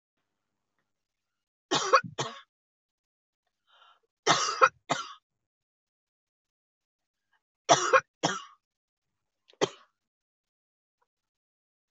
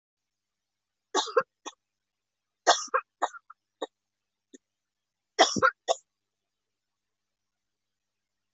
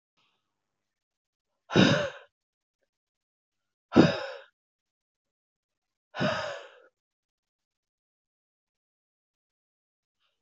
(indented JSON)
{
  "three_cough_length": "11.9 s",
  "three_cough_amplitude": 16805,
  "three_cough_signal_mean_std_ratio": 0.23,
  "cough_length": "8.5 s",
  "cough_amplitude": 16900,
  "cough_signal_mean_std_ratio": 0.22,
  "exhalation_length": "10.4 s",
  "exhalation_amplitude": 19655,
  "exhalation_signal_mean_std_ratio": 0.21,
  "survey_phase": "beta (2021-08-13 to 2022-03-07)",
  "age": "45-64",
  "gender": "Female",
  "wearing_mask": "No",
  "symptom_cough_any": true,
  "smoker_status": "Never smoked",
  "respiratory_condition_asthma": false,
  "respiratory_condition_other": false,
  "recruitment_source": "REACT",
  "submission_delay": "2 days",
  "covid_test_result": "Negative",
  "covid_test_method": "RT-qPCR",
  "influenza_a_test_result": "Negative",
  "influenza_b_test_result": "Negative"
}